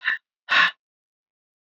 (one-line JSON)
{"exhalation_length": "1.6 s", "exhalation_amplitude": 17643, "exhalation_signal_mean_std_ratio": 0.35, "survey_phase": "beta (2021-08-13 to 2022-03-07)", "age": "65+", "gender": "Female", "wearing_mask": "No", "symptom_cough_any": true, "symptom_fatigue": true, "symptom_headache": true, "smoker_status": "Never smoked", "respiratory_condition_asthma": false, "respiratory_condition_other": false, "recruitment_source": "Test and Trace", "submission_delay": "2 days", "covid_test_result": "Positive", "covid_test_method": "RT-qPCR", "covid_ct_value": 27.5, "covid_ct_gene": "ORF1ab gene"}